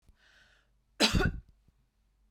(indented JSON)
{
  "cough_length": "2.3 s",
  "cough_amplitude": 8424,
  "cough_signal_mean_std_ratio": 0.31,
  "survey_phase": "beta (2021-08-13 to 2022-03-07)",
  "age": "65+",
  "gender": "Female",
  "wearing_mask": "No",
  "symptom_none": true,
  "smoker_status": "Ex-smoker",
  "respiratory_condition_asthma": false,
  "respiratory_condition_other": false,
  "recruitment_source": "REACT",
  "submission_delay": "2 days",
  "covid_test_result": "Negative",
  "covid_test_method": "RT-qPCR",
  "influenza_a_test_result": "Negative",
  "influenza_b_test_result": "Negative"
}